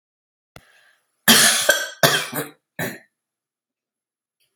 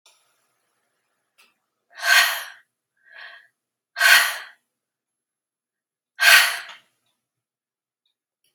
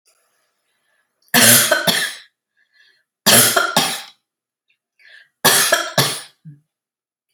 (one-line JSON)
{"cough_length": "4.6 s", "cough_amplitude": 32768, "cough_signal_mean_std_ratio": 0.34, "exhalation_length": "8.5 s", "exhalation_amplitude": 32159, "exhalation_signal_mean_std_ratio": 0.27, "three_cough_length": "7.3 s", "three_cough_amplitude": 32768, "three_cough_signal_mean_std_ratio": 0.41, "survey_phase": "alpha (2021-03-01 to 2021-08-12)", "age": "65+", "gender": "Female", "wearing_mask": "No", "symptom_none": true, "smoker_status": "Never smoked", "respiratory_condition_asthma": false, "respiratory_condition_other": false, "recruitment_source": "REACT", "submission_delay": "2 days", "covid_test_result": "Negative", "covid_test_method": "RT-qPCR"}